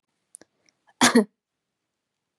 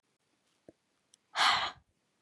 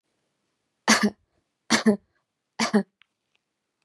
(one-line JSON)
{"cough_length": "2.4 s", "cough_amplitude": 26753, "cough_signal_mean_std_ratio": 0.22, "exhalation_length": "2.2 s", "exhalation_amplitude": 6796, "exhalation_signal_mean_std_ratio": 0.31, "three_cough_length": "3.8 s", "three_cough_amplitude": 23151, "three_cough_signal_mean_std_ratio": 0.3, "survey_phase": "beta (2021-08-13 to 2022-03-07)", "age": "18-44", "gender": "Female", "wearing_mask": "No", "symptom_none": true, "smoker_status": "Never smoked", "respiratory_condition_asthma": false, "respiratory_condition_other": false, "recruitment_source": "REACT", "submission_delay": "1 day", "covid_test_result": "Negative", "covid_test_method": "RT-qPCR", "influenza_a_test_result": "Negative", "influenza_b_test_result": "Negative"}